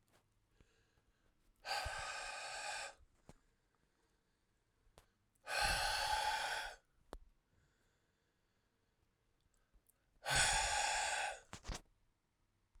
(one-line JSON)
{"exhalation_length": "12.8 s", "exhalation_amplitude": 3041, "exhalation_signal_mean_std_ratio": 0.44, "survey_phase": "alpha (2021-03-01 to 2021-08-12)", "age": "18-44", "gender": "Male", "wearing_mask": "No", "symptom_cough_any": true, "smoker_status": "Ex-smoker", "respiratory_condition_asthma": false, "respiratory_condition_other": false, "recruitment_source": "Test and Trace", "submission_delay": "1 day", "covid_test_result": "Positive", "covid_test_method": "RT-qPCR", "covid_ct_value": 19.0, "covid_ct_gene": "ORF1ab gene", "covid_ct_mean": 19.9, "covid_viral_load": "300000 copies/ml", "covid_viral_load_category": "Low viral load (10K-1M copies/ml)"}